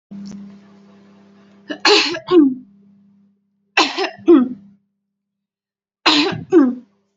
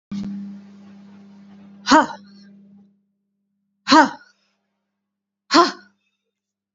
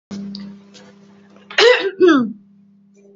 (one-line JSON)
{"three_cough_length": "7.2 s", "three_cough_amplitude": 32767, "three_cough_signal_mean_std_ratio": 0.4, "exhalation_length": "6.7 s", "exhalation_amplitude": 31051, "exhalation_signal_mean_std_ratio": 0.27, "cough_length": "3.2 s", "cough_amplitude": 29127, "cough_signal_mean_std_ratio": 0.42, "survey_phase": "beta (2021-08-13 to 2022-03-07)", "age": "18-44", "gender": "Female", "wearing_mask": "Yes", "symptom_none": true, "smoker_status": "Never smoked", "respiratory_condition_asthma": false, "respiratory_condition_other": false, "recruitment_source": "REACT", "submission_delay": "2 days", "covid_test_result": "Negative", "covid_test_method": "RT-qPCR", "influenza_a_test_result": "Negative", "influenza_b_test_result": "Negative"}